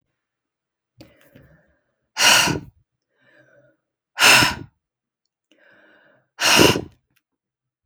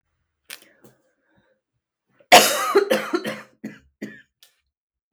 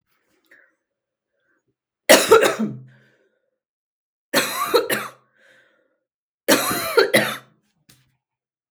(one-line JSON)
{"exhalation_length": "7.9 s", "exhalation_amplitude": 32766, "exhalation_signal_mean_std_ratio": 0.3, "cough_length": "5.1 s", "cough_amplitude": 32768, "cough_signal_mean_std_ratio": 0.28, "three_cough_length": "8.7 s", "three_cough_amplitude": 32768, "three_cough_signal_mean_std_ratio": 0.33, "survey_phase": "beta (2021-08-13 to 2022-03-07)", "age": "45-64", "gender": "Female", "wearing_mask": "No", "symptom_cough_any": true, "symptom_runny_or_blocked_nose": true, "symptom_sore_throat": true, "symptom_fatigue": true, "symptom_headache": true, "symptom_other": true, "symptom_onset": "3 days", "smoker_status": "Never smoked", "respiratory_condition_asthma": false, "respiratory_condition_other": false, "recruitment_source": "Test and Trace", "submission_delay": "2 days", "covid_test_result": "Positive", "covid_test_method": "ePCR"}